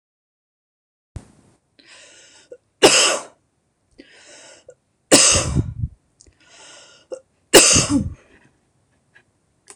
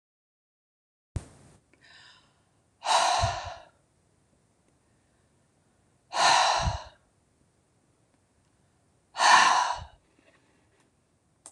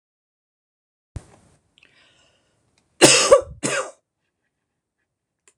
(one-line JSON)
{"three_cough_length": "9.8 s", "three_cough_amplitude": 26028, "three_cough_signal_mean_std_ratio": 0.31, "exhalation_length": "11.5 s", "exhalation_amplitude": 17011, "exhalation_signal_mean_std_ratio": 0.32, "cough_length": "5.6 s", "cough_amplitude": 26028, "cough_signal_mean_std_ratio": 0.23, "survey_phase": "alpha (2021-03-01 to 2021-08-12)", "age": "45-64", "gender": "Female", "wearing_mask": "No", "symptom_none": true, "smoker_status": "Never smoked", "respiratory_condition_asthma": false, "respiratory_condition_other": false, "recruitment_source": "REACT", "submission_delay": "2 days", "covid_test_result": "Negative", "covid_test_method": "RT-qPCR"}